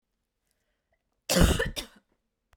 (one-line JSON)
{"cough_length": "2.6 s", "cough_amplitude": 14347, "cough_signal_mean_std_ratio": 0.31, "survey_phase": "beta (2021-08-13 to 2022-03-07)", "age": "18-44", "gender": "Female", "wearing_mask": "No", "symptom_none": true, "smoker_status": "Never smoked", "respiratory_condition_asthma": false, "respiratory_condition_other": false, "recruitment_source": "REACT", "submission_delay": "1 day", "covid_test_result": "Negative", "covid_test_method": "RT-qPCR", "influenza_a_test_result": "Unknown/Void", "influenza_b_test_result": "Unknown/Void"}